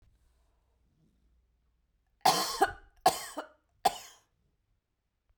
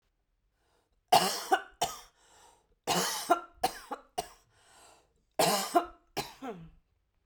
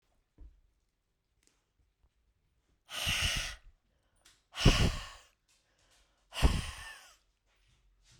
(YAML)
three_cough_length: 5.4 s
three_cough_amplitude: 10012
three_cough_signal_mean_std_ratio: 0.26
cough_length: 7.3 s
cough_amplitude: 11488
cough_signal_mean_std_ratio: 0.36
exhalation_length: 8.2 s
exhalation_amplitude: 10347
exhalation_signal_mean_std_ratio: 0.29
survey_phase: beta (2021-08-13 to 2022-03-07)
age: 45-64
gender: Female
wearing_mask: 'No'
symptom_none: true
smoker_status: Never smoked
respiratory_condition_asthma: false
respiratory_condition_other: false
recruitment_source: REACT
submission_delay: 1 day
covid_test_result: Negative
covid_test_method: RT-qPCR